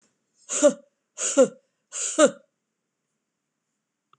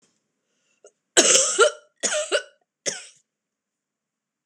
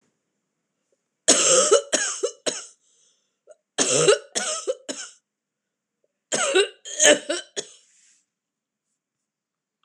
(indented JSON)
{
  "exhalation_length": "4.2 s",
  "exhalation_amplitude": 22510,
  "exhalation_signal_mean_std_ratio": 0.29,
  "cough_length": "4.5 s",
  "cough_amplitude": 26028,
  "cough_signal_mean_std_ratio": 0.34,
  "three_cough_length": "9.8 s",
  "three_cough_amplitude": 26028,
  "three_cough_signal_mean_std_ratio": 0.37,
  "survey_phase": "beta (2021-08-13 to 2022-03-07)",
  "age": "65+",
  "gender": "Female",
  "wearing_mask": "No",
  "symptom_cough_any": true,
  "symptom_runny_or_blocked_nose": true,
  "symptom_fatigue": true,
  "symptom_onset": "3 days",
  "smoker_status": "Never smoked",
  "respiratory_condition_asthma": false,
  "respiratory_condition_other": false,
  "recruitment_source": "Test and Trace",
  "submission_delay": "1 day",
  "covid_test_result": "Positive",
  "covid_test_method": "RT-qPCR",
  "covid_ct_value": 18.5,
  "covid_ct_gene": "N gene"
}